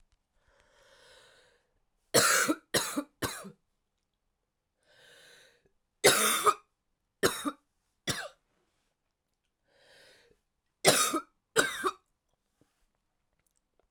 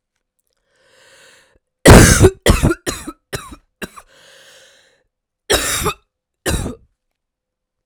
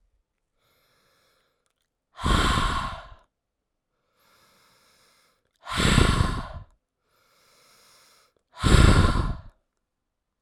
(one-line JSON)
{"three_cough_length": "13.9 s", "three_cough_amplitude": 18047, "three_cough_signal_mean_std_ratio": 0.3, "cough_length": "7.9 s", "cough_amplitude": 32768, "cough_signal_mean_std_ratio": 0.3, "exhalation_length": "10.4 s", "exhalation_amplitude": 25763, "exhalation_signal_mean_std_ratio": 0.35, "survey_phase": "alpha (2021-03-01 to 2021-08-12)", "age": "18-44", "gender": "Female", "wearing_mask": "Yes", "symptom_cough_any": true, "symptom_new_continuous_cough": true, "symptom_shortness_of_breath": true, "symptom_abdominal_pain": true, "symptom_diarrhoea": true, "symptom_fatigue": true, "symptom_headache": true, "symptom_onset": "3 days", "smoker_status": "Current smoker (1 to 10 cigarettes per day)", "respiratory_condition_asthma": false, "respiratory_condition_other": false, "recruitment_source": "Test and Trace", "submission_delay": "2 days", "covid_test_result": "Positive", "covid_test_method": "RT-qPCR", "covid_ct_value": 15.1, "covid_ct_gene": "ORF1ab gene", "covid_ct_mean": 15.4, "covid_viral_load": "8600000 copies/ml", "covid_viral_load_category": "High viral load (>1M copies/ml)"}